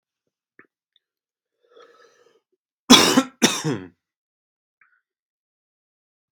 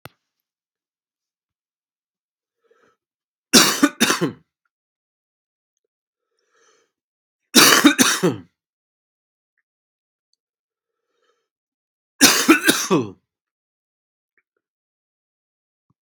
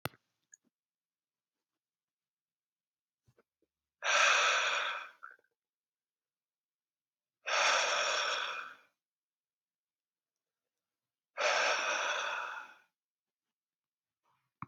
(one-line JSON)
{"cough_length": "6.3 s", "cough_amplitude": 32768, "cough_signal_mean_std_ratio": 0.22, "three_cough_length": "16.0 s", "three_cough_amplitude": 32768, "three_cough_signal_mean_std_ratio": 0.25, "exhalation_length": "14.7 s", "exhalation_amplitude": 5811, "exhalation_signal_mean_std_ratio": 0.38, "survey_phase": "beta (2021-08-13 to 2022-03-07)", "age": "18-44", "gender": "Male", "wearing_mask": "No", "symptom_new_continuous_cough": true, "symptom_runny_or_blocked_nose": true, "symptom_fever_high_temperature": true, "symptom_onset": "3 days", "smoker_status": "Ex-smoker", "respiratory_condition_asthma": false, "respiratory_condition_other": false, "recruitment_source": "Test and Trace", "submission_delay": "2 days", "covid_test_result": "Positive", "covid_test_method": "RT-qPCR", "covid_ct_value": 21.7, "covid_ct_gene": "ORF1ab gene", "covid_ct_mean": 22.1, "covid_viral_load": "56000 copies/ml", "covid_viral_load_category": "Low viral load (10K-1M copies/ml)"}